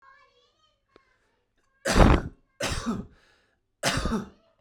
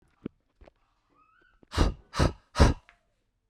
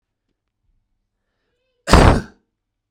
three_cough_length: 4.6 s
three_cough_amplitude: 25922
three_cough_signal_mean_std_ratio: 0.34
exhalation_length: 3.5 s
exhalation_amplitude: 19290
exhalation_signal_mean_std_ratio: 0.28
cough_length: 2.9 s
cough_amplitude: 32768
cough_signal_mean_std_ratio: 0.25
survey_phase: beta (2021-08-13 to 2022-03-07)
age: 18-44
gender: Male
wearing_mask: 'No'
symptom_none: true
symptom_onset: 3 days
smoker_status: Never smoked
respiratory_condition_asthma: false
respiratory_condition_other: false
recruitment_source: REACT
submission_delay: 3 days
covid_test_result: Negative
covid_test_method: RT-qPCR
influenza_a_test_result: Negative
influenza_b_test_result: Negative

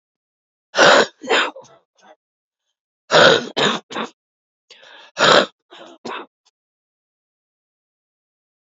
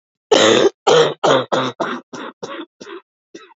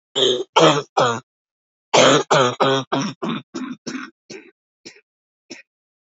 exhalation_length: 8.6 s
exhalation_amplitude: 30800
exhalation_signal_mean_std_ratio: 0.32
cough_length: 3.6 s
cough_amplitude: 29655
cough_signal_mean_std_ratio: 0.51
three_cough_length: 6.1 s
three_cough_amplitude: 29525
three_cough_signal_mean_std_ratio: 0.46
survey_phase: beta (2021-08-13 to 2022-03-07)
age: 45-64
gender: Female
wearing_mask: 'No'
symptom_cough_any: true
symptom_new_continuous_cough: true
symptom_runny_or_blocked_nose: true
symptom_shortness_of_breath: true
symptom_sore_throat: true
symptom_abdominal_pain: true
symptom_fatigue: true
symptom_fever_high_temperature: true
symptom_headache: true
symptom_change_to_sense_of_smell_or_taste: true
symptom_loss_of_taste: true
symptom_other: true
symptom_onset: 5 days
smoker_status: Ex-smoker
respiratory_condition_asthma: false
respiratory_condition_other: false
recruitment_source: Test and Trace
submission_delay: 2 days
covid_test_result: Positive
covid_test_method: RT-qPCR
covid_ct_value: 21.5
covid_ct_gene: ORF1ab gene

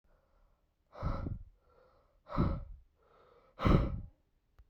exhalation_length: 4.7 s
exhalation_amplitude: 8560
exhalation_signal_mean_std_ratio: 0.36
survey_phase: beta (2021-08-13 to 2022-03-07)
age: 18-44
gender: Male
wearing_mask: 'No'
symptom_cough_any: true
symptom_fatigue: true
symptom_headache: true
symptom_onset: 4 days
smoker_status: Never smoked
respiratory_condition_asthma: false
respiratory_condition_other: false
recruitment_source: REACT
submission_delay: 1 day
covid_test_result: Negative
covid_test_method: RT-qPCR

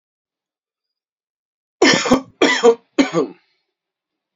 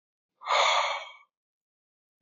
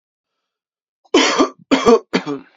cough_length: 4.4 s
cough_amplitude: 30492
cough_signal_mean_std_ratio: 0.35
exhalation_length: 2.2 s
exhalation_amplitude: 8688
exhalation_signal_mean_std_ratio: 0.41
three_cough_length: 2.6 s
three_cough_amplitude: 28123
three_cough_signal_mean_std_ratio: 0.43
survey_phase: beta (2021-08-13 to 2022-03-07)
age: 18-44
gender: Male
wearing_mask: 'No'
symptom_none: true
smoker_status: Never smoked
respiratory_condition_asthma: false
respiratory_condition_other: false
recruitment_source: REACT
submission_delay: 3 days
covid_test_result: Negative
covid_test_method: RT-qPCR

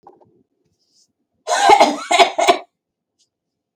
cough_length: 3.8 s
cough_amplitude: 32768
cough_signal_mean_std_ratio: 0.37
survey_phase: beta (2021-08-13 to 2022-03-07)
age: 45-64
gender: Female
wearing_mask: 'No'
symptom_none: true
smoker_status: Never smoked
respiratory_condition_asthma: false
respiratory_condition_other: false
recruitment_source: REACT
submission_delay: 3 days
covid_test_result: Negative
covid_test_method: RT-qPCR
influenza_a_test_result: Negative
influenza_b_test_result: Negative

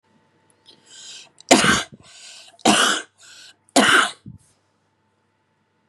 three_cough_length: 5.9 s
three_cough_amplitude: 32767
three_cough_signal_mean_std_ratio: 0.34
survey_phase: beta (2021-08-13 to 2022-03-07)
age: 18-44
gender: Female
wearing_mask: 'No'
symptom_fatigue: true
smoker_status: Never smoked
respiratory_condition_asthma: false
respiratory_condition_other: false
recruitment_source: REACT
submission_delay: 6 days
covid_test_result: Negative
covid_test_method: RT-qPCR
influenza_a_test_result: Negative
influenza_b_test_result: Negative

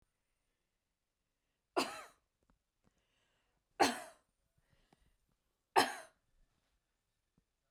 three_cough_length: 7.7 s
three_cough_amplitude: 7161
three_cough_signal_mean_std_ratio: 0.19
survey_phase: beta (2021-08-13 to 2022-03-07)
age: 65+
gender: Female
wearing_mask: 'No'
symptom_none: true
smoker_status: Ex-smoker
respiratory_condition_asthma: false
respiratory_condition_other: false
recruitment_source: REACT
submission_delay: 5 days
covid_test_result: Negative
covid_test_method: RT-qPCR
influenza_a_test_result: Negative
influenza_b_test_result: Negative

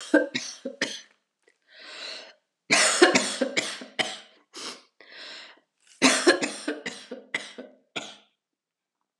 three_cough_length: 9.2 s
three_cough_amplitude: 30784
three_cough_signal_mean_std_ratio: 0.38
survey_phase: alpha (2021-03-01 to 2021-08-12)
age: 65+
gender: Female
wearing_mask: 'No'
symptom_cough_any: true
symptom_headache: true
symptom_onset: 3 days
smoker_status: Never smoked
respiratory_condition_asthma: false
respiratory_condition_other: false
recruitment_source: Test and Trace
submission_delay: 1 day
covid_test_result: Positive
covid_test_method: RT-qPCR
covid_ct_value: 21.1
covid_ct_gene: ORF1ab gene
covid_ct_mean: 22.1
covid_viral_load: 54000 copies/ml
covid_viral_load_category: Low viral load (10K-1M copies/ml)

